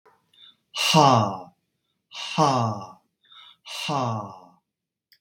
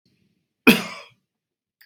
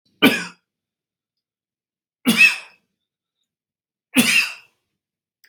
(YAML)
exhalation_length: 5.2 s
exhalation_amplitude: 25159
exhalation_signal_mean_std_ratio: 0.42
cough_length: 1.9 s
cough_amplitude: 32767
cough_signal_mean_std_ratio: 0.21
three_cough_length: 5.5 s
three_cough_amplitude: 32767
three_cough_signal_mean_std_ratio: 0.29
survey_phase: beta (2021-08-13 to 2022-03-07)
age: 45-64
gender: Male
wearing_mask: 'No'
symptom_none: true
smoker_status: Never smoked
respiratory_condition_asthma: false
respiratory_condition_other: false
recruitment_source: REACT
submission_delay: 1 day
covid_test_result: Negative
covid_test_method: RT-qPCR
influenza_a_test_result: Negative
influenza_b_test_result: Negative